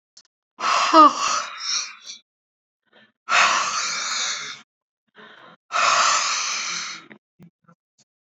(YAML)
exhalation_length: 8.3 s
exhalation_amplitude: 26620
exhalation_signal_mean_std_ratio: 0.48
survey_phase: alpha (2021-03-01 to 2021-08-12)
age: 65+
gender: Female
wearing_mask: 'No'
symptom_none: true
smoker_status: Current smoker (1 to 10 cigarettes per day)
respiratory_condition_asthma: false
respiratory_condition_other: false
recruitment_source: REACT
submission_delay: 1 day
covid_test_result: Negative
covid_test_method: RT-qPCR